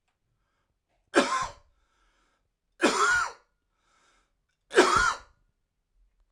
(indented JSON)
{
  "three_cough_length": "6.3 s",
  "three_cough_amplitude": 17299,
  "three_cough_signal_mean_std_ratio": 0.34,
  "survey_phase": "alpha (2021-03-01 to 2021-08-12)",
  "age": "18-44",
  "gender": "Male",
  "wearing_mask": "No",
  "symptom_headache": true,
  "symptom_change_to_sense_of_smell_or_taste": true,
  "smoker_status": "Current smoker (11 or more cigarettes per day)",
  "respiratory_condition_asthma": false,
  "respiratory_condition_other": false,
  "recruitment_source": "Test and Trace",
  "submission_delay": "1 day",
  "covid_test_result": "Positive",
  "covid_test_method": "RT-qPCR"
}